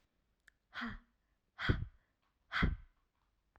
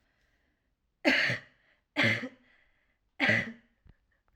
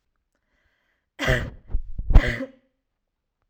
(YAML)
exhalation_length: 3.6 s
exhalation_amplitude: 4511
exhalation_signal_mean_std_ratio: 0.32
three_cough_length: 4.4 s
three_cough_amplitude: 10409
three_cough_signal_mean_std_ratio: 0.37
cough_length: 3.5 s
cough_amplitude: 32767
cough_signal_mean_std_ratio: 0.29
survey_phase: alpha (2021-03-01 to 2021-08-12)
age: 18-44
gender: Female
wearing_mask: 'No'
symptom_none: true
smoker_status: Never smoked
respiratory_condition_asthma: false
respiratory_condition_other: false
recruitment_source: REACT
submission_delay: 1 day
covid_test_result: Negative
covid_test_method: RT-qPCR